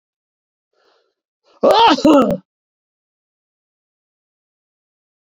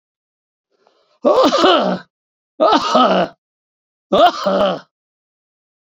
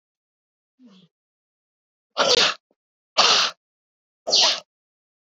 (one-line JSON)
{"cough_length": "5.2 s", "cough_amplitude": 28992, "cough_signal_mean_std_ratio": 0.3, "three_cough_length": "5.8 s", "three_cough_amplitude": 31071, "three_cough_signal_mean_std_ratio": 0.49, "exhalation_length": "5.3 s", "exhalation_amplitude": 21773, "exhalation_signal_mean_std_ratio": 0.34, "survey_phase": "beta (2021-08-13 to 2022-03-07)", "age": "65+", "gender": "Male", "wearing_mask": "No", "symptom_none": true, "smoker_status": "Ex-smoker", "respiratory_condition_asthma": false, "respiratory_condition_other": false, "recruitment_source": "REACT", "submission_delay": "2 days", "covid_test_result": "Negative", "covid_test_method": "RT-qPCR", "influenza_a_test_result": "Negative", "influenza_b_test_result": "Negative"}